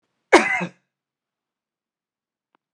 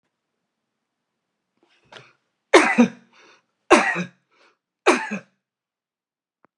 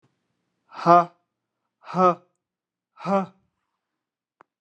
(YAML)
cough_length: 2.7 s
cough_amplitude: 32767
cough_signal_mean_std_ratio: 0.22
three_cough_length: 6.6 s
three_cough_amplitude: 32767
three_cough_signal_mean_std_ratio: 0.26
exhalation_length: 4.6 s
exhalation_amplitude: 25630
exhalation_signal_mean_std_ratio: 0.26
survey_phase: beta (2021-08-13 to 2022-03-07)
age: 65+
gender: Male
wearing_mask: 'No'
symptom_none: true
smoker_status: Ex-smoker
respiratory_condition_asthma: false
respiratory_condition_other: false
recruitment_source: REACT
submission_delay: 4 days
covid_test_result: Negative
covid_test_method: RT-qPCR